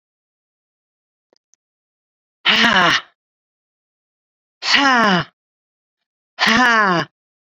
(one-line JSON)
{"exhalation_length": "7.6 s", "exhalation_amplitude": 32767, "exhalation_signal_mean_std_ratio": 0.38, "survey_phase": "beta (2021-08-13 to 2022-03-07)", "age": "65+", "gender": "Female", "wearing_mask": "No", "symptom_cough_any": true, "symptom_shortness_of_breath": true, "symptom_fatigue": true, "smoker_status": "Ex-smoker", "respiratory_condition_asthma": false, "respiratory_condition_other": false, "recruitment_source": "REACT", "submission_delay": "1 day", "covid_test_result": "Negative", "covid_test_method": "RT-qPCR"}